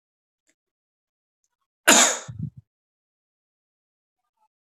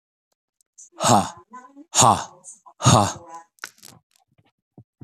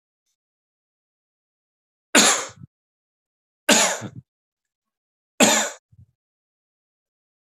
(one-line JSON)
{"cough_length": "4.8 s", "cough_amplitude": 32767, "cough_signal_mean_std_ratio": 0.2, "exhalation_length": "5.0 s", "exhalation_amplitude": 25438, "exhalation_signal_mean_std_ratio": 0.32, "three_cough_length": "7.4 s", "three_cough_amplitude": 30035, "three_cough_signal_mean_std_ratio": 0.26, "survey_phase": "beta (2021-08-13 to 2022-03-07)", "age": "18-44", "gender": "Male", "wearing_mask": "No", "symptom_cough_any": true, "symptom_sore_throat": true, "symptom_headache": true, "symptom_onset": "8 days", "smoker_status": "Ex-smoker", "respiratory_condition_asthma": false, "respiratory_condition_other": false, "recruitment_source": "REACT", "submission_delay": "10 days", "covid_test_result": "Negative", "covid_test_method": "RT-qPCR", "influenza_a_test_result": "Negative", "influenza_b_test_result": "Negative"}